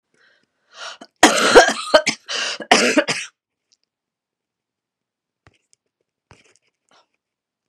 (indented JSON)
{
  "cough_length": "7.7 s",
  "cough_amplitude": 32768,
  "cough_signal_mean_std_ratio": 0.29,
  "survey_phase": "beta (2021-08-13 to 2022-03-07)",
  "age": "65+",
  "gender": "Female",
  "wearing_mask": "No",
  "symptom_cough_any": true,
  "symptom_runny_or_blocked_nose": true,
  "symptom_fatigue": true,
  "symptom_onset": "3 days",
  "smoker_status": "Never smoked",
  "respiratory_condition_asthma": false,
  "respiratory_condition_other": false,
  "recruitment_source": "Test and Trace",
  "submission_delay": "1 day",
  "covid_test_result": "Positive",
  "covid_test_method": "ePCR"
}